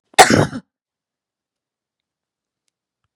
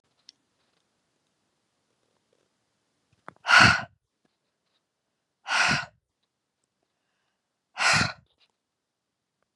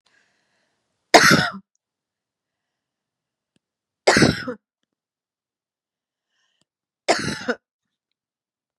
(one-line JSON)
{"cough_length": "3.2 s", "cough_amplitude": 32768, "cough_signal_mean_std_ratio": 0.22, "exhalation_length": "9.6 s", "exhalation_amplitude": 26433, "exhalation_signal_mean_std_ratio": 0.23, "three_cough_length": "8.8 s", "three_cough_amplitude": 32768, "three_cough_signal_mean_std_ratio": 0.24, "survey_phase": "beta (2021-08-13 to 2022-03-07)", "age": "45-64", "gender": "Female", "wearing_mask": "No", "symptom_fatigue": true, "smoker_status": "Never smoked", "respiratory_condition_asthma": false, "respiratory_condition_other": false, "recruitment_source": "REACT", "submission_delay": "2 days", "covid_test_result": "Negative", "covid_test_method": "RT-qPCR", "influenza_a_test_result": "Negative", "influenza_b_test_result": "Negative"}